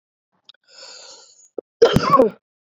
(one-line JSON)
{"cough_length": "2.6 s", "cough_amplitude": 27339, "cough_signal_mean_std_ratio": 0.33, "survey_phase": "beta (2021-08-13 to 2022-03-07)", "age": "18-44", "gender": "Female", "wearing_mask": "No", "symptom_cough_any": true, "symptom_shortness_of_breath": true, "symptom_sore_throat": true, "symptom_abdominal_pain": true, "symptom_fever_high_temperature": true, "symptom_headache": true, "symptom_onset": "2 days", "smoker_status": "Never smoked", "respiratory_condition_asthma": true, "respiratory_condition_other": false, "recruitment_source": "Test and Trace", "submission_delay": "1 day", "covid_test_result": "Positive", "covid_test_method": "RT-qPCR", "covid_ct_value": 24.8, "covid_ct_gene": "ORF1ab gene"}